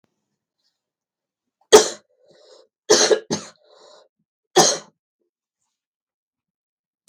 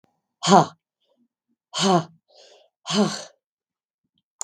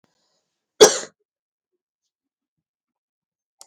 {"three_cough_length": "7.1 s", "three_cough_amplitude": 32768, "three_cough_signal_mean_std_ratio": 0.23, "exhalation_length": "4.4 s", "exhalation_amplitude": 32766, "exhalation_signal_mean_std_ratio": 0.3, "cough_length": "3.7 s", "cough_amplitude": 32768, "cough_signal_mean_std_ratio": 0.14, "survey_phase": "beta (2021-08-13 to 2022-03-07)", "age": "65+", "gender": "Female", "wearing_mask": "No", "symptom_cough_any": true, "symptom_runny_or_blocked_nose": true, "symptom_sore_throat": true, "symptom_other": true, "smoker_status": "Never smoked", "respiratory_condition_asthma": false, "respiratory_condition_other": false, "recruitment_source": "Test and Trace", "submission_delay": "2 days", "covid_test_result": "Positive", "covid_test_method": "LFT"}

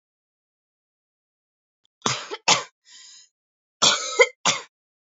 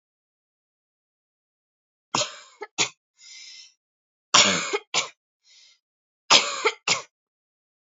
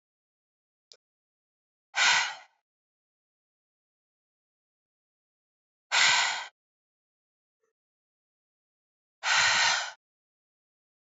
{"cough_length": "5.1 s", "cough_amplitude": 28326, "cough_signal_mean_std_ratio": 0.28, "three_cough_length": "7.9 s", "three_cough_amplitude": 29359, "three_cough_signal_mean_std_ratio": 0.28, "exhalation_length": "11.2 s", "exhalation_amplitude": 12776, "exhalation_signal_mean_std_ratio": 0.29, "survey_phase": "alpha (2021-03-01 to 2021-08-12)", "age": "18-44", "gender": "Female", "wearing_mask": "No", "symptom_cough_any": true, "symptom_fatigue": true, "symptom_loss_of_taste": true, "symptom_onset": "3 days", "smoker_status": "Never smoked", "respiratory_condition_asthma": false, "respiratory_condition_other": false, "recruitment_source": "Test and Trace", "submission_delay": "2 days", "covid_test_result": "Positive", "covid_test_method": "RT-qPCR"}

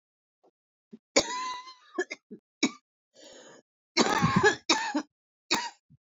{"cough_length": "6.1 s", "cough_amplitude": 14227, "cough_signal_mean_std_ratio": 0.39, "survey_phase": "beta (2021-08-13 to 2022-03-07)", "age": "45-64", "gender": "Male", "wearing_mask": "No", "symptom_cough_any": true, "symptom_runny_or_blocked_nose": true, "symptom_sore_throat": true, "symptom_fatigue": true, "symptom_headache": true, "symptom_onset": "-1 day", "smoker_status": "Current smoker (1 to 10 cigarettes per day)", "respiratory_condition_asthma": false, "respiratory_condition_other": false, "recruitment_source": "Test and Trace", "submission_delay": "-3 days", "covid_test_result": "Positive", "covid_test_method": "ePCR"}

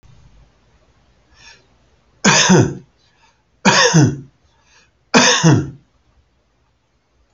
{"three_cough_length": "7.3 s", "three_cough_amplitude": 32309, "three_cough_signal_mean_std_ratio": 0.38, "survey_phase": "alpha (2021-03-01 to 2021-08-12)", "age": "65+", "gender": "Male", "wearing_mask": "No", "symptom_none": true, "smoker_status": "Ex-smoker", "respiratory_condition_asthma": false, "respiratory_condition_other": false, "recruitment_source": "REACT", "submission_delay": "3 days", "covid_test_result": "Negative", "covid_test_method": "RT-qPCR"}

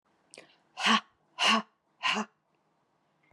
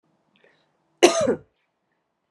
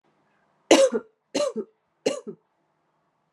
{"exhalation_length": "3.3 s", "exhalation_amplitude": 9022, "exhalation_signal_mean_std_ratio": 0.35, "cough_length": "2.3 s", "cough_amplitude": 29351, "cough_signal_mean_std_ratio": 0.26, "three_cough_length": "3.3 s", "three_cough_amplitude": 29293, "three_cough_signal_mean_std_ratio": 0.31, "survey_phase": "beta (2021-08-13 to 2022-03-07)", "age": "18-44", "gender": "Female", "wearing_mask": "No", "symptom_other": true, "smoker_status": "Never smoked", "respiratory_condition_asthma": false, "respiratory_condition_other": false, "recruitment_source": "Test and Trace", "submission_delay": "2 days", "covid_test_result": "Positive", "covid_test_method": "ePCR"}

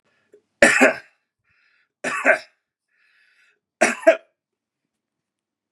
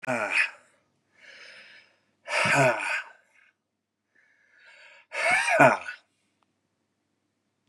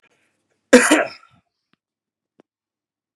{"three_cough_length": "5.7 s", "three_cough_amplitude": 32767, "three_cough_signal_mean_std_ratio": 0.27, "exhalation_length": "7.7 s", "exhalation_amplitude": 28054, "exhalation_signal_mean_std_ratio": 0.37, "cough_length": "3.2 s", "cough_amplitude": 32768, "cough_signal_mean_std_ratio": 0.23, "survey_phase": "beta (2021-08-13 to 2022-03-07)", "age": "45-64", "gender": "Male", "wearing_mask": "No", "symptom_sore_throat": true, "symptom_headache": true, "symptom_onset": "2 days", "smoker_status": "Never smoked", "respiratory_condition_asthma": false, "respiratory_condition_other": false, "recruitment_source": "Test and Trace", "submission_delay": "2 days", "covid_test_result": "Positive", "covid_test_method": "RT-qPCR", "covid_ct_value": 17.7, "covid_ct_gene": "ORF1ab gene"}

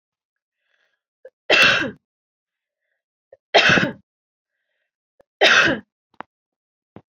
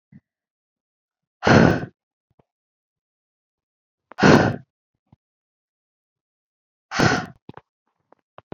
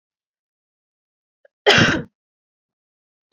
{"three_cough_length": "7.1 s", "three_cough_amplitude": 32738, "three_cough_signal_mean_std_ratio": 0.31, "exhalation_length": "8.5 s", "exhalation_amplitude": 27990, "exhalation_signal_mean_std_ratio": 0.25, "cough_length": "3.3 s", "cough_amplitude": 27456, "cough_signal_mean_std_ratio": 0.25, "survey_phase": "beta (2021-08-13 to 2022-03-07)", "age": "18-44", "gender": "Female", "wearing_mask": "No", "symptom_runny_or_blocked_nose": true, "symptom_change_to_sense_of_smell_or_taste": true, "symptom_loss_of_taste": true, "smoker_status": "Ex-smoker", "respiratory_condition_asthma": false, "respiratory_condition_other": false, "recruitment_source": "Test and Trace", "submission_delay": "1 day", "covid_test_result": "Positive", "covid_test_method": "LFT"}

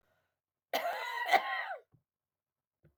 {"cough_length": "3.0 s", "cough_amplitude": 7721, "cough_signal_mean_std_ratio": 0.4, "survey_phase": "beta (2021-08-13 to 2022-03-07)", "age": "65+", "gender": "Female", "wearing_mask": "No", "symptom_none": true, "symptom_onset": "8 days", "smoker_status": "Never smoked", "respiratory_condition_asthma": false, "respiratory_condition_other": false, "recruitment_source": "REACT", "submission_delay": "6 days", "covid_test_result": "Negative", "covid_test_method": "RT-qPCR"}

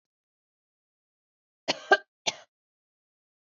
{"cough_length": "3.4 s", "cough_amplitude": 14561, "cough_signal_mean_std_ratio": 0.15, "survey_phase": "beta (2021-08-13 to 2022-03-07)", "age": "18-44", "gender": "Female", "wearing_mask": "No", "symptom_none": true, "smoker_status": "Never smoked", "respiratory_condition_asthma": true, "respiratory_condition_other": false, "recruitment_source": "REACT", "submission_delay": "2 days", "covid_test_result": "Negative", "covid_test_method": "RT-qPCR", "influenza_a_test_result": "Negative", "influenza_b_test_result": "Negative"}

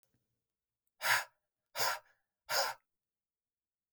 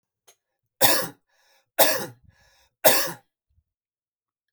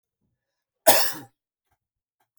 {"exhalation_length": "3.9 s", "exhalation_amplitude": 4436, "exhalation_signal_mean_std_ratio": 0.32, "three_cough_length": "4.5 s", "three_cough_amplitude": 32767, "three_cough_signal_mean_std_ratio": 0.3, "cough_length": "2.4 s", "cough_amplitude": 32768, "cough_signal_mean_std_ratio": 0.24, "survey_phase": "alpha (2021-03-01 to 2021-08-12)", "age": "45-64", "gender": "Male", "wearing_mask": "No", "symptom_none": true, "smoker_status": "Never smoked", "respiratory_condition_asthma": false, "respiratory_condition_other": false, "recruitment_source": "Test and Trace", "submission_delay": "0 days", "covid_test_result": "Negative", "covid_test_method": "LFT"}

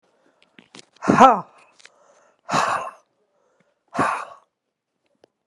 {"exhalation_length": "5.5 s", "exhalation_amplitude": 32768, "exhalation_signal_mean_std_ratio": 0.28, "survey_phase": "alpha (2021-03-01 to 2021-08-12)", "age": "45-64", "gender": "Female", "wearing_mask": "No", "symptom_fatigue": true, "symptom_change_to_sense_of_smell_or_taste": true, "symptom_onset": "2 days", "smoker_status": "Ex-smoker", "respiratory_condition_asthma": false, "respiratory_condition_other": false, "recruitment_source": "Test and Trace", "submission_delay": "1 day", "covid_test_result": "Positive", "covid_test_method": "RT-qPCR", "covid_ct_value": 14.0, "covid_ct_gene": "ORF1ab gene", "covid_ct_mean": 14.3, "covid_viral_load": "20000000 copies/ml", "covid_viral_load_category": "High viral load (>1M copies/ml)"}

